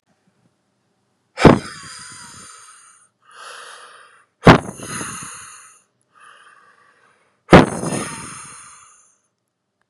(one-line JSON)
{"exhalation_length": "9.9 s", "exhalation_amplitude": 32768, "exhalation_signal_mean_std_ratio": 0.23, "survey_phase": "beta (2021-08-13 to 2022-03-07)", "age": "18-44", "gender": "Male", "wearing_mask": "No", "symptom_cough_any": true, "symptom_runny_or_blocked_nose": true, "symptom_sore_throat": true, "symptom_fatigue": true, "symptom_headache": true, "smoker_status": "Ex-smoker", "respiratory_condition_asthma": false, "respiratory_condition_other": false, "recruitment_source": "Test and Trace", "submission_delay": "2 days", "covid_test_result": "Positive", "covid_test_method": "LFT"}